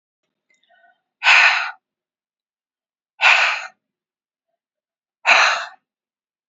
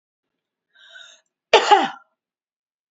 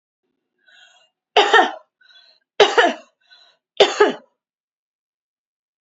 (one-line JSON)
{"exhalation_length": "6.5 s", "exhalation_amplitude": 30168, "exhalation_signal_mean_std_ratio": 0.33, "cough_length": "2.9 s", "cough_amplitude": 29199, "cough_signal_mean_std_ratio": 0.25, "three_cough_length": "5.8 s", "three_cough_amplitude": 32016, "three_cough_signal_mean_std_ratio": 0.3, "survey_phase": "beta (2021-08-13 to 2022-03-07)", "age": "65+", "gender": "Female", "wearing_mask": "No", "symptom_runny_or_blocked_nose": true, "smoker_status": "Never smoked", "respiratory_condition_asthma": false, "respiratory_condition_other": false, "recruitment_source": "Test and Trace", "submission_delay": "2 days", "covid_test_result": "Positive", "covid_test_method": "RT-qPCR", "covid_ct_value": 12.5, "covid_ct_gene": "ORF1ab gene"}